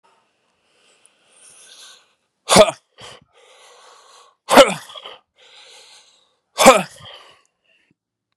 exhalation_length: 8.4 s
exhalation_amplitude: 32768
exhalation_signal_mean_std_ratio: 0.22
survey_phase: beta (2021-08-13 to 2022-03-07)
age: 45-64
gender: Male
wearing_mask: 'No'
symptom_cough_any: true
symptom_runny_or_blocked_nose: true
symptom_shortness_of_breath: true
symptom_fatigue: true
symptom_headache: true
symptom_change_to_sense_of_smell_or_taste: true
symptom_onset: 4 days
smoker_status: Ex-smoker
respiratory_condition_asthma: true
respiratory_condition_other: false
recruitment_source: Test and Trace
submission_delay: 1 day
covid_test_result: Positive
covid_test_method: RT-qPCR
covid_ct_value: 17.5
covid_ct_gene: ORF1ab gene
covid_ct_mean: 17.7
covid_viral_load: 1600000 copies/ml
covid_viral_load_category: High viral load (>1M copies/ml)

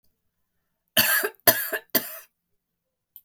three_cough_length: 3.2 s
three_cough_amplitude: 32046
three_cough_signal_mean_std_ratio: 0.33
survey_phase: beta (2021-08-13 to 2022-03-07)
age: 45-64
gender: Female
wearing_mask: 'No'
symptom_headache: true
smoker_status: Current smoker (e-cigarettes or vapes only)
respiratory_condition_asthma: true
respiratory_condition_other: false
recruitment_source: REACT
submission_delay: 1 day
covid_test_result: Negative
covid_test_method: RT-qPCR
influenza_a_test_result: Negative
influenza_b_test_result: Negative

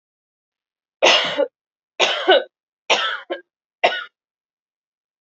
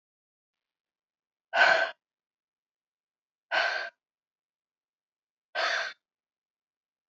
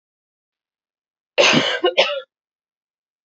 three_cough_length: 5.2 s
three_cough_amplitude: 30013
three_cough_signal_mean_std_ratio: 0.37
exhalation_length: 7.1 s
exhalation_amplitude: 12121
exhalation_signal_mean_std_ratio: 0.28
cough_length: 3.2 s
cough_amplitude: 27246
cough_signal_mean_std_ratio: 0.36
survey_phase: beta (2021-08-13 to 2022-03-07)
age: 18-44
gender: Female
wearing_mask: 'No'
symptom_cough_any: true
symptom_runny_or_blocked_nose: true
symptom_sore_throat: true
symptom_fatigue: true
symptom_other: true
smoker_status: Never smoked
respiratory_condition_asthma: false
respiratory_condition_other: false
recruitment_source: Test and Trace
submission_delay: 1 day
covid_test_result: Positive
covid_test_method: LFT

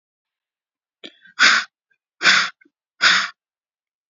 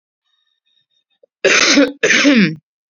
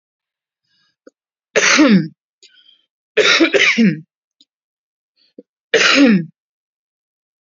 exhalation_length: 4.1 s
exhalation_amplitude: 32374
exhalation_signal_mean_std_ratio: 0.34
cough_length: 2.9 s
cough_amplitude: 32768
cough_signal_mean_std_ratio: 0.5
three_cough_length: 7.4 s
three_cough_amplitude: 30678
three_cough_signal_mean_std_ratio: 0.41
survey_phase: beta (2021-08-13 to 2022-03-07)
age: 18-44
gender: Female
wearing_mask: 'No'
symptom_none: true
smoker_status: Never smoked
respiratory_condition_asthma: false
respiratory_condition_other: false
recruitment_source: REACT
submission_delay: 1 day
covid_test_result: Negative
covid_test_method: RT-qPCR
influenza_a_test_result: Negative
influenza_b_test_result: Negative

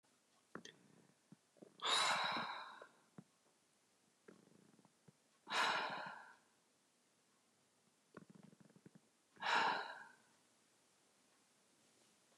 exhalation_length: 12.4 s
exhalation_amplitude: 1975
exhalation_signal_mean_std_ratio: 0.35
survey_phase: beta (2021-08-13 to 2022-03-07)
age: 45-64
gender: Female
wearing_mask: 'No'
symptom_fatigue: true
symptom_onset: 12 days
smoker_status: Never smoked
respiratory_condition_asthma: false
respiratory_condition_other: false
recruitment_source: REACT
submission_delay: 1 day
covid_test_result: Negative
covid_test_method: RT-qPCR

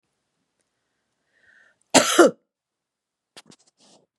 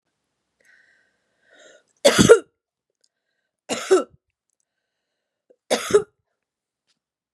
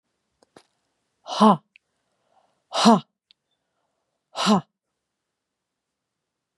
cough_length: 4.2 s
cough_amplitude: 32767
cough_signal_mean_std_ratio: 0.21
three_cough_length: 7.3 s
three_cough_amplitude: 32742
three_cough_signal_mean_std_ratio: 0.23
exhalation_length: 6.6 s
exhalation_amplitude: 26802
exhalation_signal_mean_std_ratio: 0.24
survey_phase: beta (2021-08-13 to 2022-03-07)
age: 45-64
gender: Female
wearing_mask: 'No'
symptom_none: true
smoker_status: Never smoked
respiratory_condition_asthma: false
respiratory_condition_other: false
recruitment_source: REACT
submission_delay: 2 days
covid_test_result: Negative
covid_test_method: RT-qPCR
influenza_a_test_result: Negative
influenza_b_test_result: Negative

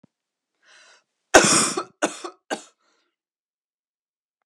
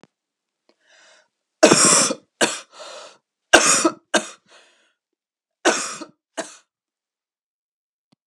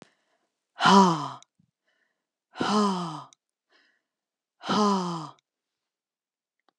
cough_length: 4.5 s
cough_amplitude: 32768
cough_signal_mean_std_ratio: 0.25
three_cough_length: 8.3 s
three_cough_amplitude: 32768
three_cough_signal_mean_std_ratio: 0.31
exhalation_length: 6.8 s
exhalation_amplitude: 19772
exhalation_signal_mean_std_ratio: 0.35
survey_phase: alpha (2021-03-01 to 2021-08-12)
age: 45-64
gender: Female
wearing_mask: 'No'
symptom_cough_any: true
symptom_fatigue: true
symptom_headache: true
symptom_onset: 8 days
smoker_status: Never smoked
respiratory_condition_asthma: false
respiratory_condition_other: false
recruitment_source: REACT
submission_delay: 1 day
covid_test_result: Negative
covid_test_method: RT-qPCR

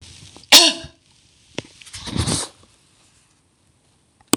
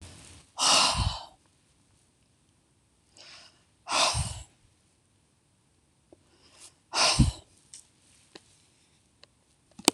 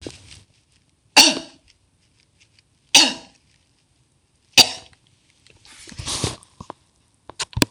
cough_length: 4.4 s
cough_amplitude: 26028
cough_signal_mean_std_ratio: 0.26
exhalation_length: 9.9 s
exhalation_amplitude: 26028
exhalation_signal_mean_std_ratio: 0.3
three_cough_length: 7.7 s
three_cough_amplitude: 26028
three_cough_signal_mean_std_ratio: 0.23
survey_phase: beta (2021-08-13 to 2022-03-07)
age: 65+
gender: Female
wearing_mask: 'No'
symptom_none: true
smoker_status: Never smoked
recruitment_source: REACT
submission_delay: 1 day
covid_test_result: Negative
covid_test_method: RT-qPCR
influenza_a_test_result: Negative
influenza_b_test_result: Negative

